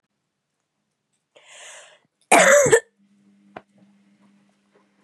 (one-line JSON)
{"cough_length": "5.0 s", "cough_amplitude": 28618, "cough_signal_mean_std_ratio": 0.26, "survey_phase": "beta (2021-08-13 to 2022-03-07)", "age": "18-44", "gender": "Female", "wearing_mask": "No", "symptom_runny_or_blocked_nose": true, "symptom_fatigue": true, "symptom_other": true, "symptom_onset": "3 days", "smoker_status": "Never smoked", "respiratory_condition_asthma": false, "respiratory_condition_other": false, "recruitment_source": "Test and Trace", "submission_delay": "1 day", "covid_test_result": "Positive", "covid_test_method": "RT-qPCR", "covid_ct_value": 18.2, "covid_ct_gene": "ORF1ab gene", "covid_ct_mean": 18.4, "covid_viral_load": "920000 copies/ml", "covid_viral_load_category": "Low viral load (10K-1M copies/ml)"}